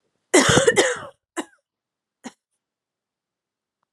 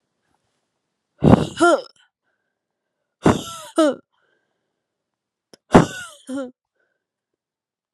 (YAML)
cough_length: 3.9 s
cough_amplitude: 28939
cough_signal_mean_std_ratio: 0.31
exhalation_length: 7.9 s
exhalation_amplitude: 32768
exhalation_signal_mean_std_ratio: 0.26
survey_phase: alpha (2021-03-01 to 2021-08-12)
age: 18-44
gender: Female
wearing_mask: 'No'
symptom_cough_any: true
symptom_new_continuous_cough: true
symptom_diarrhoea: true
symptom_fatigue: true
symptom_fever_high_temperature: true
symptom_headache: true
symptom_onset: 4 days
smoker_status: Never smoked
respiratory_condition_asthma: false
respiratory_condition_other: false
recruitment_source: Test and Trace
submission_delay: 2 days
covid_test_result: Positive
covid_test_method: RT-qPCR
covid_ct_value: 18.0
covid_ct_gene: N gene
covid_ct_mean: 19.2
covid_viral_load: 510000 copies/ml
covid_viral_load_category: Low viral load (10K-1M copies/ml)